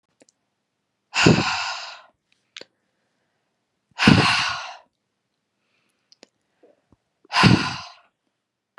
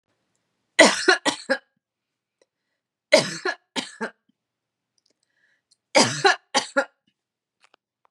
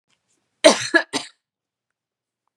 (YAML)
exhalation_length: 8.8 s
exhalation_amplitude: 32728
exhalation_signal_mean_std_ratio: 0.31
three_cough_length: 8.1 s
three_cough_amplitude: 32398
three_cough_signal_mean_std_ratio: 0.29
cough_length: 2.6 s
cough_amplitude: 32767
cough_signal_mean_std_ratio: 0.24
survey_phase: beta (2021-08-13 to 2022-03-07)
age: 45-64
gender: Female
wearing_mask: 'No'
symptom_none: true
smoker_status: Never smoked
respiratory_condition_asthma: false
respiratory_condition_other: false
recruitment_source: REACT
submission_delay: 2 days
covid_test_result: Negative
covid_test_method: RT-qPCR
influenza_a_test_result: Unknown/Void
influenza_b_test_result: Unknown/Void